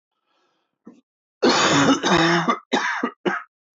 {"cough_length": "3.8 s", "cough_amplitude": 17965, "cough_signal_mean_std_ratio": 0.56, "survey_phase": "alpha (2021-03-01 to 2021-08-12)", "age": "45-64", "gender": "Male", "wearing_mask": "No", "symptom_new_continuous_cough": true, "symptom_fatigue": true, "symptom_fever_high_temperature": true, "symptom_headache": true, "symptom_change_to_sense_of_smell_or_taste": true, "symptom_onset": "3 days", "smoker_status": "Ex-smoker", "respiratory_condition_asthma": true, "respiratory_condition_other": false, "recruitment_source": "Test and Trace", "submission_delay": "2 days", "covid_test_result": "Positive", "covid_test_method": "RT-qPCR", "covid_ct_value": 16.4, "covid_ct_gene": "ORF1ab gene", "covid_ct_mean": 17.1, "covid_viral_load": "2500000 copies/ml", "covid_viral_load_category": "High viral load (>1M copies/ml)"}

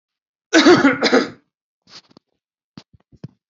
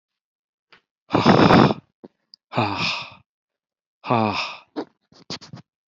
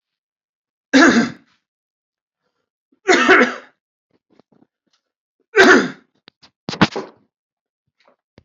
{"cough_length": "3.5 s", "cough_amplitude": 31516, "cough_signal_mean_std_ratio": 0.35, "exhalation_length": "5.9 s", "exhalation_amplitude": 31810, "exhalation_signal_mean_std_ratio": 0.37, "three_cough_length": "8.4 s", "three_cough_amplitude": 32141, "three_cough_signal_mean_std_ratio": 0.31, "survey_phase": "beta (2021-08-13 to 2022-03-07)", "age": "45-64", "gender": "Male", "wearing_mask": "No", "symptom_new_continuous_cough": true, "symptom_fatigue": true, "symptom_headache": true, "smoker_status": "Ex-smoker", "respiratory_condition_asthma": false, "respiratory_condition_other": false, "recruitment_source": "Test and Trace", "submission_delay": "1 day", "covid_test_result": "Positive", "covid_test_method": "RT-qPCR", "covid_ct_value": 21.2, "covid_ct_gene": "ORF1ab gene", "covid_ct_mean": 22.1, "covid_viral_load": "56000 copies/ml", "covid_viral_load_category": "Low viral load (10K-1M copies/ml)"}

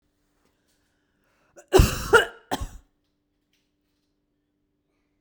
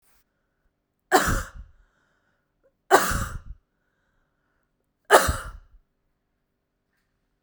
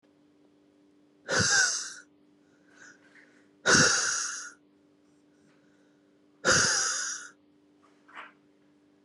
{"cough_length": "5.2 s", "cough_amplitude": 28652, "cough_signal_mean_std_ratio": 0.22, "three_cough_length": "7.4 s", "three_cough_amplitude": 32767, "three_cough_signal_mean_std_ratio": 0.26, "exhalation_length": "9.0 s", "exhalation_amplitude": 14057, "exhalation_signal_mean_std_ratio": 0.39, "survey_phase": "beta (2021-08-13 to 2022-03-07)", "age": "18-44", "gender": "Female", "wearing_mask": "No", "symptom_none": true, "smoker_status": "Never smoked", "respiratory_condition_asthma": false, "respiratory_condition_other": false, "recruitment_source": "REACT", "submission_delay": "1 day", "covid_test_result": "Negative", "covid_test_method": "RT-qPCR", "influenza_a_test_result": "Negative", "influenza_b_test_result": "Negative"}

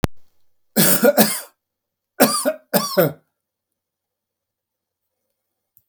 {"three_cough_length": "5.9 s", "three_cough_amplitude": 32768, "three_cough_signal_mean_std_ratio": 0.36, "survey_phase": "beta (2021-08-13 to 2022-03-07)", "age": "65+", "gender": "Male", "wearing_mask": "No", "symptom_none": true, "smoker_status": "Ex-smoker", "respiratory_condition_asthma": true, "respiratory_condition_other": false, "recruitment_source": "REACT", "submission_delay": "2 days", "covid_test_result": "Negative", "covid_test_method": "RT-qPCR"}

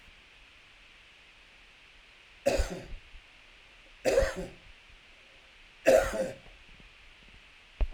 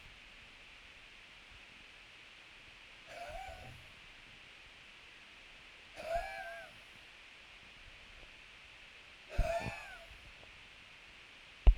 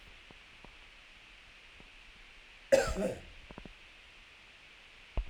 {"three_cough_length": "7.9 s", "three_cough_amplitude": 11476, "three_cough_signal_mean_std_ratio": 0.34, "exhalation_length": "11.8 s", "exhalation_amplitude": 8957, "exhalation_signal_mean_std_ratio": 0.29, "cough_length": "5.3 s", "cough_amplitude": 8165, "cough_signal_mean_std_ratio": 0.33, "survey_phase": "beta (2021-08-13 to 2022-03-07)", "age": "45-64", "gender": "Male", "wearing_mask": "No", "symptom_none": true, "smoker_status": "Never smoked", "respiratory_condition_asthma": false, "respiratory_condition_other": false, "recruitment_source": "REACT", "submission_delay": "2 days", "covid_test_result": "Negative", "covid_test_method": "RT-qPCR", "influenza_a_test_result": "Negative", "influenza_b_test_result": "Negative"}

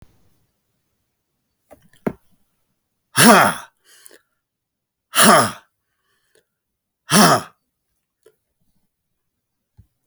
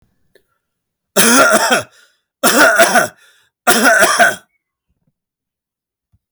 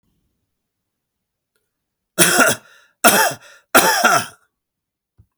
{"exhalation_length": "10.1 s", "exhalation_amplitude": 32768, "exhalation_signal_mean_std_ratio": 0.25, "three_cough_length": "6.3 s", "three_cough_amplitude": 32768, "three_cough_signal_mean_std_ratio": 0.48, "cough_length": "5.4 s", "cough_amplitude": 32768, "cough_signal_mean_std_ratio": 0.37, "survey_phase": "alpha (2021-03-01 to 2021-08-12)", "age": "65+", "gender": "Male", "wearing_mask": "No", "symptom_none": true, "smoker_status": "Never smoked", "respiratory_condition_asthma": false, "respiratory_condition_other": false, "recruitment_source": "REACT", "submission_delay": "3 days", "covid_test_result": "Negative", "covid_test_method": "RT-qPCR"}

